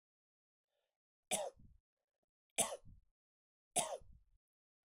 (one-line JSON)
{"three_cough_length": "4.9 s", "three_cough_amplitude": 3200, "three_cough_signal_mean_std_ratio": 0.26, "survey_phase": "beta (2021-08-13 to 2022-03-07)", "age": "45-64", "gender": "Male", "wearing_mask": "Yes", "symptom_cough_any": true, "symptom_runny_or_blocked_nose": true, "symptom_sore_throat": true, "symptom_headache": true, "symptom_change_to_sense_of_smell_or_taste": true, "symptom_onset": "5 days", "smoker_status": "Never smoked", "respiratory_condition_asthma": false, "respiratory_condition_other": false, "recruitment_source": "Test and Trace", "submission_delay": "2 days", "covid_test_result": "Positive", "covid_test_method": "RT-qPCR"}